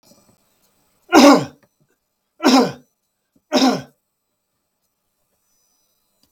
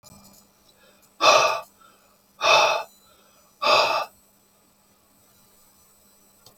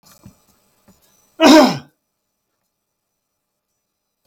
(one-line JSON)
{"three_cough_length": "6.3 s", "three_cough_amplitude": 32768, "three_cough_signal_mean_std_ratio": 0.28, "exhalation_length": "6.6 s", "exhalation_amplitude": 24417, "exhalation_signal_mean_std_ratio": 0.35, "cough_length": "4.3 s", "cough_amplitude": 32768, "cough_signal_mean_std_ratio": 0.23, "survey_phase": "beta (2021-08-13 to 2022-03-07)", "age": "65+", "gender": "Male", "wearing_mask": "No", "symptom_none": true, "smoker_status": "Never smoked", "respiratory_condition_asthma": false, "respiratory_condition_other": false, "recruitment_source": "REACT", "submission_delay": "2 days", "covid_test_result": "Negative", "covid_test_method": "RT-qPCR"}